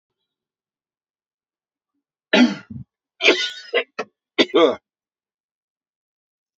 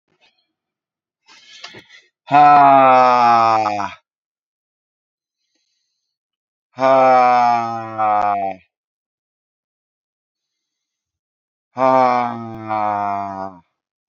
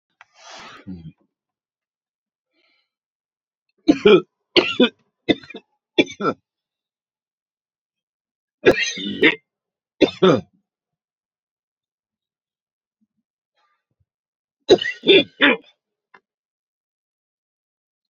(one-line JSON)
{"cough_length": "6.6 s", "cough_amplitude": 29631, "cough_signal_mean_std_ratio": 0.28, "exhalation_length": "14.1 s", "exhalation_amplitude": 28006, "exhalation_signal_mean_std_ratio": 0.46, "three_cough_length": "18.1 s", "three_cough_amplitude": 30921, "three_cough_signal_mean_std_ratio": 0.24, "survey_phase": "beta (2021-08-13 to 2022-03-07)", "age": "45-64", "gender": "Male", "wearing_mask": "No", "symptom_none": true, "smoker_status": "Ex-smoker", "respiratory_condition_asthma": false, "respiratory_condition_other": false, "recruitment_source": "REACT", "submission_delay": "2 days", "covid_test_result": "Negative", "covid_test_method": "RT-qPCR"}